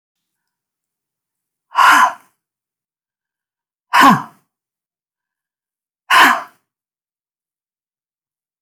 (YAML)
exhalation_length: 8.6 s
exhalation_amplitude: 32767
exhalation_signal_mean_std_ratio: 0.26
survey_phase: beta (2021-08-13 to 2022-03-07)
age: 65+
gender: Female
wearing_mask: 'No'
symptom_fatigue: true
smoker_status: Never smoked
respiratory_condition_asthma: false
respiratory_condition_other: false
recruitment_source: REACT
submission_delay: 2 days
covid_test_result: Negative
covid_test_method: RT-qPCR
influenza_a_test_result: Negative
influenza_b_test_result: Negative